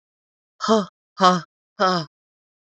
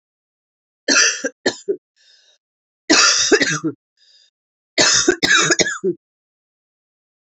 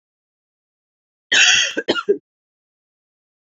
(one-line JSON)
{"exhalation_length": "2.7 s", "exhalation_amplitude": 27109, "exhalation_signal_mean_std_ratio": 0.36, "three_cough_length": "7.3 s", "three_cough_amplitude": 32767, "three_cough_signal_mean_std_ratio": 0.44, "cough_length": "3.6 s", "cough_amplitude": 30317, "cough_signal_mean_std_ratio": 0.33, "survey_phase": "beta (2021-08-13 to 2022-03-07)", "age": "45-64", "gender": "Female", "wearing_mask": "No", "symptom_cough_any": true, "symptom_runny_or_blocked_nose": true, "symptom_fatigue": true, "symptom_headache": true, "symptom_other": true, "symptom_onset": "3 days", "smoker_status": "Never smoked", "respiratory_condition_asthma": false, "respiratory_condition_other": false, "recruitment_source": "Test and Trace", "submission_delay": "2 days", "covid_test_result": "Positive", "covid_test_method": "RT-qPCR", "covid_ct_value": 19.2, "covid_ct_gene": "ORF1ab gene", "covid_ct_mean": 20.0, "covid_viral_load": "270000 copies/ml", "covid_viral_load_category": "Low viral load (10K-1M copies/ml)"}